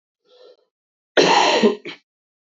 {
  "cough_length": "2.5 s",
  "cough_amplitude": 26524,
  "cough_signal_mean_std_ratio": 0.41,
  "survey_phase": "beta (2021-08-13 to 2022-03-07)",
  "age": "18-44",
  "gender": "Female",
  "wearing_mask": "No",
  "symptom_cough_any": true,
  "symptom_runny_or_blocked_nose": true,
  "symptom_shortness_of_breath": true,
  "symptom_sore_throat": true,
  "symptom_fatigue": true,
  "symptom_fever_high_temperature": true,
  "symptom_headache": true,
  "smoker_status": "Never smoked",
  "respiratory_condition_asthma": false,
  "respiratory_condition_other": false,
  "recruitment_source": "Test and Trace",
  "submission_delay": "2 days",
  "covid_test_result": "Positive",
  "covid_test_method": "LFT"
}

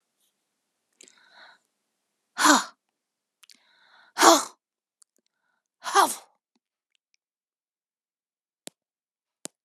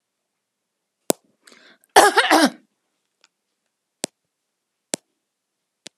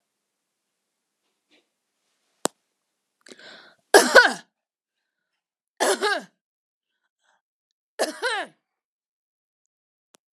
{
  "exhalation_length": "9.6 s",
  "exhalation_amplitude": 29991,
  "exhalation_signal_mean_std_ratio": 0.2,
  "cough_length": "6.0 s",
  "cough_amplitude": 32768,
  "cough_signal_mean_std_ratio": 0.21,
  "three_cough_length": "10.3 s",
  "three_cough_amplitude": 32767,
  "three_cough_signal_mean_std_ratio": 0.2,
  "survey_phase": "beta (2021-08-13 to 2022-03-07)",
  "age": "65+",
  "gender": "Female",
  "wearing_mask": "No",
  "symptom_fatigue": true,
  "smoker_status": "Ex-smoker",
  "respiratory_condition_asthma": false,
  "respiratory_condition_other": false,
  "recruitment_source": "REACT",
  "submission_delay": "1 day",
  "covid_test_result": "Negative",
  "covid_test_method": "RT-qPCR"
}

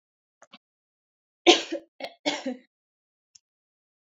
{
  "cough_length": "4.1 s",
  "cough_amplitude": 28056,
  "cough_signal_mean_std_ratio": 0.21,
  "survey_phase": "alpha (2021-03-01 to 2021-08-12)",
  "age": "18-44",
  "gender": "Female",
  "wearing_mask": "No",
  "symptom_none": true,
  "smoker_status": "Never smoked",
  "respiratory_condition_asthma": true,
  "respiratory_condition_other": false,
  "recruitment_source": "REACT",
  "submission_delay": "2 days",
  "covid_test_result": "Negative",
  "covid_test_method": "RT-qPCR"
}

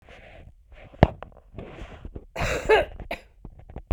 {
  "cough_length": "3.9 s",
  "cough_amplitude": 32768,
  "cough_signal_mean_std_ratio": 0.34,
  "survey_phase": "beta (2021-08-13 to 2022-03-07)",
  "age": "45-64",
  "gender": "Female",
  "wearing_mask": "No",
  "symptom_fatigue": true,
  "symptom_headache": true,
  "symptom_onset": "9 days",
  "smoker_status": "Never smoked",
  "respiratory_condition_asthma": false,
  "respiratory_condition_other": false,
  "recruitment_source": "REACT",
  "submission_delay": "3 days",
  "covid_test_result": "Positive",
  "covid_test_method": "RT-qPCR",
  "covid_ct_value": 27.0,
  "covid_ct_gene": "E gene",
  "influenza_a_test_result": "Negative",
  "influenza_b_test_result": "Negative"
}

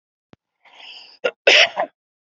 {
  "cough_length": "2.3 s",
  "cough_amplitude": 31839,
  "cough_signal_mean_std_ratio": 0.31,
  "survey_phase": "beta (2021-08-13 to 2022-03-07)",
  "age": "45-64",
  "gender": "Male",
  "wearing_mask": "No",
  "symptom_cough_any": true,
  "symptom_runny_or_blocked_nose": true,
  "symptom_sore_throat": true,
  "symptom_abdominal_pain": true,
  "symptom_fatigue": true,
  "symptom_fever_high_temperature": true,
  "symptom_headache": true,
  "smoker_status": "Never smoked",
  "respiratory_condition_asthma": false,
  "respiratory_condition_other": false,
  "recruitment_source": "Test and Trace",
  "submission_delay": "2 days",
  "covid_test_result": "Positive",
  "covid_test_method": "LFT"
}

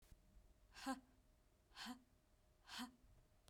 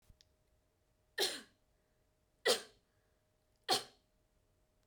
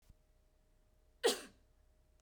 {
  "exhalation_length": "3.5 s",
  "exhalation_amplitude": 569,
  "exhalation_signal_mean_std_ratio": 0.44,
  "three_cough_length": "4.9 s",
  "three_cough_amplitude": 4610,
  "three_cough_signal_mean_std_ratio": 0.24,
  "cough_length": "2.2 s",
  "cough_amplitude": 3270,
  "cough_signal_mean_std_ratio": 0.23,
  "survey_phase": "beta (2021-08-13 to 2022-03-07)",
  "age": "18-44",
  "gender": "Female",
  "wearing_mask": "No",
  "symptom_none": true,
  "smoker_status": "Never smoked",
  "respiratory_condition_asthma": false,
  "respiratory_condition_other": false,
  "recruitment_source": "REACT",
  "submission_delay": "2 days",
  "covid_test_result": "Negative",
  "covid_test_method": "RT-qPCR"
}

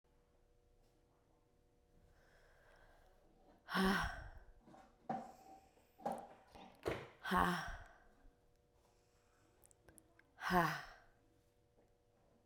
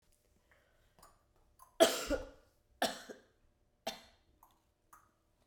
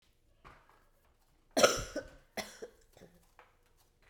{
  "exhalation_length": "12.5 s",
  "exhalation_amplitude": 3280,
  "exhalation_signal_mean_std_ratio": 0.33,
  "three_cough_length": "5.5 s",
  "three_cough_amplitude": 8838,
  "three_cough_signal_mean_std_ratio": 0.23,
  "cough_length": "4.1 s",
  "cough_amplitude": 10813,
  "cough_signal_mean_std_ratio": 0.24,
  "survey_phase": "beta (2021-08-13 to 2022-03-07)",
  "age": "18-44",
  "gender": "Female",
  "wearing_mask": "No",
  "symptom_cough_any": true,
  "symptom_runny_or_blocked_nose": true,
  "symptom_sore_throat": true,
  "symptom_diarrhoea": true,
  "symptom_fatigue": true,
  "symptom_headache": true,
  "symptom_loss_of_taste": true,
  "symptom_onset": "4 days",
  "smoker_status": "Never smoked",
  "respiratory_condition_asthma": false,
  "respiratory_condition_other": false,
  "recruitment_source": "Test and Trace",
  "submission_delay": "2 days",
  "covid_test_result": "Positive",
  "covid_test_method": "RT-qPCR",
  "covid_ct_value": 16.2,
  "covid_ct_gene": "N gene"
}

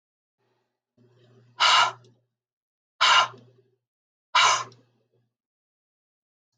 {
  "exhalation_length": "6.6 s",
  "exhalation_amplitude": 15745,
  "exhalation_signal_mean_std_ratio": 0.29,
  "survey_phase": "alpha (2021-03-01 to 2021-08-12)",
  "age": "45-64",
  "gender": "Female",
  "wearing_mask": "No",
  "symptom_none": true,
  "smoker_status": "Ex-smoker",
  "respiratory_condition_asthma": false,
  "respiratory_condition_other": false,
  "recruitment_source": "REACT",
  "submission_delay": "1 day",
  "covid_test_result": "Negative",
  "covid_test_method": "RT-qPCR"
}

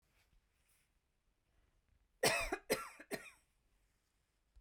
{
  "cough_length": "4.6 s",
  "cough_amplitude": 3871,
  "cough_signal_mean_std_ratio": 0.27,
  "survey_phase": "beta (2021-08-13 to 2022-03-07)",
  "age": "45-64",
  "gender": "Female",
  "wearing_mask": "No",
  "symptom_none": true,
  "smoker_status": "Never smoked",
  "respiratory_condition_asthma": true,
  "respiratory_condition_other": false,
  "recruitment_source": "REACT",
  "submission_delay": "2 days",
  "covid_test_result": "Negative",
  "covid_test_method": "RT-qPCR"
}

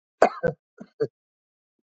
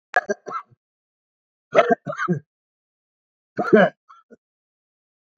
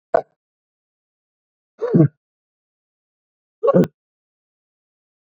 {
  "cough_length": "1.9 s",
  "cough_amplitude": 27097,
  "cough_signal_mean_std_ratio": 0.24,
  "three_cough_length": "5.4 s",
  "three_cough_amplitude": 27353,
  "three_cough_signal_mean_std_ratio": 0.28,
  "exhalation_length": "5.3 s",
  "exhalation_amplitude": 28987,
  "exhalation_signal_mean_std_ratio": 0.23,
  "survey_phase": "beta (2021-08-13 to 2022-03-07)",
  "age": "65+",
  "gender": "Male",
  "wearing_mask": "No",
  "symptom_none": true,
  "smoker_status": "Ex-smoker",
  "respiratory_condition_asthma": false,
  "respiratory_condition_other": false,
  "recruitment_source": "REACT",
  "submission_delay": "4 days",
  "covid_test_result": "Negative",
  "covid_test_method": "RT-qPCR",
  "influenza_a_test_result": "Negative",
  "influenza_b_test_result": "Negative"
}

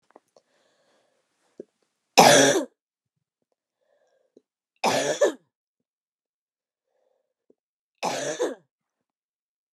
{
  "three_cough_length": "9.7 s",
  "three_cough_amplitude": 31536,
  "three_cough_signal_mean_std_ratio": 0.25,
  "survey_phase": "beta (2021-08-13 to 2022-03-07)",
  "age": "45-64",
  "gender": "Female",
  "wearing_mask": "No",
  "symptom_cough_any": true,
  "symptom_new_continuous_cough": true,
  "symptom_runny_or_blocked_nose": true,
  "symptom_sore_throat": true,
  "symptom_fatigue": true,
  "symptom_headache": true,
  "symptom_onset": "7 days",
  "smoker_status": "Ex-smoker",
  "respiratory_condition_asthma": false,
  "respiratory_condition_other": false,
  "recruitment_source": "Test and Trace",
  "submission_delay": "2 days",
  "covid_test_result": "Positive",
  "covid_test_method": "ePCR"
}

